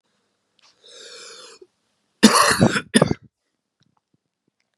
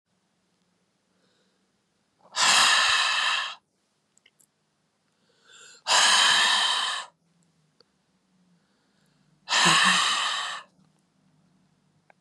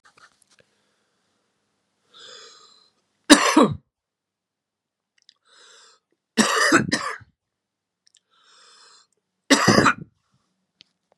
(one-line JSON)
{"cough_length": "4.8 s", "cough_amplitude": 32768, "cough_signal_mean_std_ratio": 0.28, "exhalation_length": "12.2 s", "exhalation_amplitude": 15238, "exhalation_signal_mean_std_ratio": 0.43, "three_cough_length": "11.2 s", "three_cough_amplitude": 32768, "three_cough_signal_mean_std_ratio": 0.27, "survey_phase": "beta (2021-08-13 to 2022-03-07)", "age": "45-64", "gender": "Male", "wearing_mask": "No", "symptom_cough_any": true, "symptom_runny_or_blocked_nose": true, "symptom_sore_throat": true, "symptom_headache": true, "smoker_status": "Never smoked", "respiratory_condition_asthma": true, "respiratory_condition_other": false, "recruitment_source": "Test and Trace", "submission_delay": "2 days", "covid_test_result": "Positive", "covid_test_method": "RT-qPCR", "covid_ct_value": 19.5, "covid_ct_gene": "N gene"}